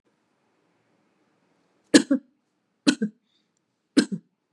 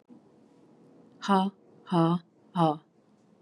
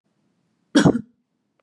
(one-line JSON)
{"three_cough_length": "4.5 s", "three_cough_amplitude": 29006, "three_cough_signal_mean_std_ratio": 0.21, "exhalation_length": "3.4 s", "exhalation_amplitude": 8949, "exhalation_signal_mean_std_ratio": 0.39, "cough_length": "1.6 s", "cough_amplitude": 25820, "cough_signal_mean_std_ratio": 0.28, "survey_phase": "beta (2021-08-13 to 2022-03-07)", "age": "45-64", "gender": "Female", "wearing_mask": "No", "symptom_sore_throat": true, "symptom_onset": "3 days", "smoker_status": "Never smoked", "respiratory_condition_asthma": false, "respiratory_condition_other": false, "recruitment_source": "REACT", "submission_delay": "2 days", "covid_test_result": "Negative", "covid_test_method": "RT-qPCR", "influenza_a_test_result": "Negative", "influenza_b_test_result": "Negative"}